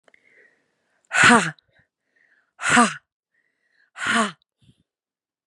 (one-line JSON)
{"exhalation_length": "5.5 s", "exhalation_amplitude": 30841, "exhalation_signal_mean_std_ratio": 0.31, "survey_phase": "beta (2021-08-13 to 2022-03-07)", "age": "18-44", "gender": "Female", "wearing_mask": "No", "symptom_new_continuous_cough": true, "symptom_sore_throat": true, "symptom_fatigue": true, "symptom_fever_high_temperature": true, "smoker_status": "Never smoked", "respiratory_condition_asthma": false, "respiratory_condition_other": false, "recruitment_source": "Test and Trace", "submission_delay": "1 day", "covid_test_result": "Positive", "covid_test_method": "RT-qPCR", "covid_ct_value": 30.5, "covid_ct_gene": "ORF1ab gene"}